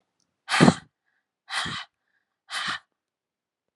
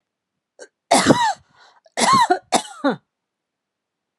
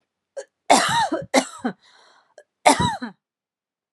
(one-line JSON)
{"exhalation_length": "3.8 s", "exhalation_amplitude": 26981, "exhalation_signal_mean_std_ratio": 0.27, "three_cough_length": "4.2 s", "three_cough_amplitude": 31926, "three_cough_signal_mean_std_ratio": 0.4, "cough_length": "3.9 s", "cough_amplitude": 30499, "cough_signal_mean_std_ratio": 0.38, "survey_phase": "beta (2021-08-13 to 2022-03-07)", "age": "45-64", "gender": "Female", "wearing_mask": "No", "symptom_none": true, "smoker_status": "Never smoked", "respiratory_condition_asthma": false, "respiratory_condition_other": false, "recruitment_source": "REACT", "submission_delay": "1 day", "covid_test_result": "Negative", "covid_test_method": "RT-qPCR"}